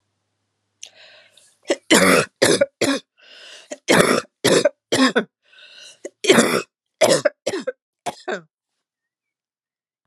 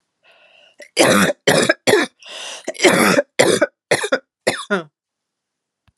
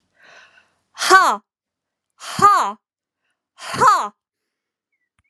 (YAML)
three_cough_length: 10.1 s
three_cough_amplitude: 32767
three_cough_signal_mean_std_ratio: 0.4
cough_length: 6.0 s
cough_amplitude: 32767
cough_signal_mean_std_ratio: 0.47
exhalation_length: 5.3 s
exhalation_amplitude: 32767
exhalation_signal_mean_std_ratio: 0.34
survey_phase: alpha (2021-03-01 to 2021-08-12)
age: 45-64
gender: Female
wearing_mask: 'No'
symptom_none: true
smoker_status: Never smoked
respiratory_condition_asthma: false
respiratory_condition_other: false
recruitment_source: REACT
submission_delay: 2 days
covid_test_result: Negative
covid_test_method: RT-qPCR